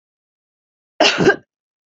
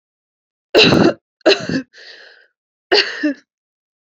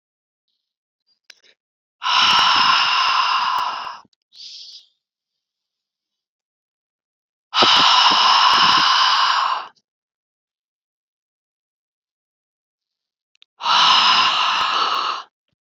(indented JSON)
{
  "cough_length": "1.9 s",
  "cough_amplitude": 28433,
  "cough_signal_mean_std_ratio": 0.33,
  "three_cough_length": "4.1 s",
  "three_cough_amplitude": 31290,
  "three_cough_signal_mean_std_ratio": 0.39,
  "exhalation_length": "15.8 s",
  "exhalation_amplitude": 28046,
  "exhalation_signal_mean_std_ratio": 0.51,
  "survey_phase": "beta (2021-08-13 to 2022-03-07)",
  "age": "18-44",
  "gender": "Female",
  "wearing_mask": "No",
  "symptom_cough_any": true,
  "symptom_runny_or_blocked_nose": true,
  "symptom_shortness_of_breath": true,
  "symptom_diarrhoea": true,
  "symptom_fatigue": true,
  "symptom_onset": "3 days",
  "smoker_status": "Never smoked",
  "respiratory_condition_asthma": false,
  "respiratory_condition_other": false,
  "recruitment_source": "Test and Trace",
  "submission_delay": "1 day",
  "covid_test_result": "Positive",
  "covid_test_method": "RT-qPCR",
  "covid_ct_value": 21.8,
  "covid_ct_gene": "N gene"
}